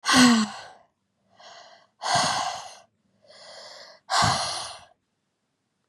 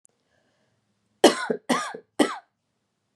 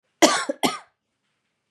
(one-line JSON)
{"exhalation_length": "5.9 s", "exhalation_amplitude": 21613, "exhalation_signal_mean_std_ratio": 0.41, "three_cough_length": "3.2 s", "three_cough_amplitude": 28770, "three_cough_signal_mean_std_ratio": 0.28, "cough_length": "1.7 s", "cough_amplitude": 31001, "cough_signal_mean_std_ratio": 0.32, "survey_phase": "beta (2021-08-13 to 2022-03-07)", "age": "18-44", "gender": "Female", "wearing_mask": "No", "symptom_none": true, "smoker_status": "Never smoked", "respiratory_condition_asthma": false, "respiratory_condition_other": false, "recruitment_source": "REACT", "submission_delay": "1 day", "covid_test_result": "Negative", "covid_test_method": "RT-qPCR", "influenza_a_test_result": "Negative", "influenza_b_test_result": "Negative"}